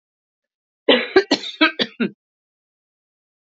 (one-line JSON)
{"cough_length": "3.5 s", "cough_amplitude": 28217, "cough_signal_mean_std_ratio": 0.31, "survey_phase": "beta (2021-08-13 to 2022-03-07)", "age": "65+", "gender": "Female", "wearing_mask": "No", "symptom_runny_or_blocked_nose": true, "symptom_sore_throat": true, "symptom_headache": true, "smoker_status": "Ex-smoker", "respiratory_condition_asthma": false, "respiratory_condition_other": false, "recruitment_source": "Test and Trace", "submission_delay": "1 day", "covid_test_result": "Positive", "covid_test_method": "LFT"}